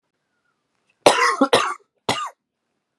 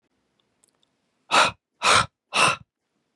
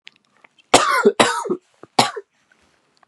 cough_length: 3.0 s
cough_amplitude: 32767
cough_signal_mean_std_ratio: 0.36
exhalation_length: 3.2 s
exhalation_amplitude: 20554
exhalation_signal_mean_std_ratio: 0.35
three_cough_length: 3.1 s
three_cough_amplitude: 32768
three_cough_signal_mean_std_ratio: 0.38
survey_phase: beta (2021-08-13 to 2022-03-07)
age: 18-44
gender: Male
wearing_mask: 'No'
symptom_cough_any: true
symptom_runny_or_blocked_nose: true
symptom_sore_throat: true
symptom_headache: true
symptom_onset: 3 days
smoker_status: Never smoked
respiratory_condition_asthma: true
respiratory_condition_other: false
recruitment_source: Test and Trace
submission_delay: 1 day
covid_test_result: Positive
covid_test_method: RT-qPCR
covid_ct_value: 20.0
covid_ct_gene: N gene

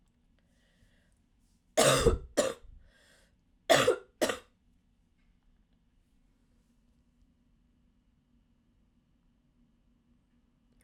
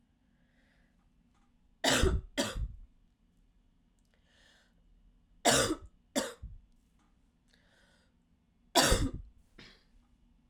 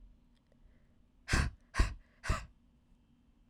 cough_length: 10.8 s
cough_amplitude: 12012
cough_signal_mean_std_ratio: 0.24
three_cough_length: 10.5 s
three_cough_amplitude: 9441
three_cough_signal_mean_std_ratio: 0.31
exhalation_length: 3.5 s
exhalation_amplitude: 6121
exhalation_signal_mean_std_ratio: 0.31
survey_phase: alpha (2021-03-01 to 2021-08-12)
age: 18-44
gender: Female
wearing_mask: 'No'
symptom_cough_any: true
symptom_new_continuous_cough: true
symptom_fatigue: true
symptom_headache: true
symptom_change_to_sense_of_smell_or_taste: true
symptom_onset: 4 days
smoker_status: Never smoked
respiratory_condition_asthma: false
respiratory_condition_other: false
recruitment_source: Test and Trace
submission_delay: 1 day
covid_test_result: Positive
covid_test_method: RT-qPCR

